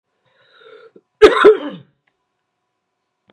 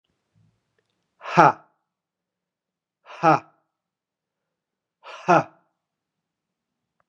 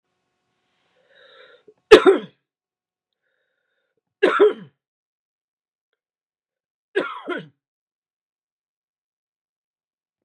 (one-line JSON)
{"cough_length": "3.3 s", "cough_amplitude": 32768, "cough_signal_mean_std_ratio": 0.26, "exhalation_length": "7.1 s", "exhalation_amplitude": 32767, "exhalation_signal_mean_std_ratio": 0.2, "three_cough_length": "10.2 s", "three_cough_amplitude": 32768, "three_cough_signal_mean_std_ratio": 0.18, "survey_phase": "beta (2021-08-13 to 2022-03-07)", "age": "45-64", "gender": "Male", "wearing_mask": "No", "symptom_cough_any": true, "symptom_new_continuous_cough": true, "symptom_runny_or_blocked_nose": true, "symptom_sore_throat": true, "symptom_onset": "3 days", "smoker_status": "Never smoked", "respiratory_condition_asthma": false, "respiratory_condition_other": false, "recruitment_source": "Test and Trace", "submission_delay": "1 day", "covid_test_result": "Positive", "covid_test_method": "RT-qPCR", "covid_ct_value": 27.3, "covid_ct_gene": "ORF1ab gene"}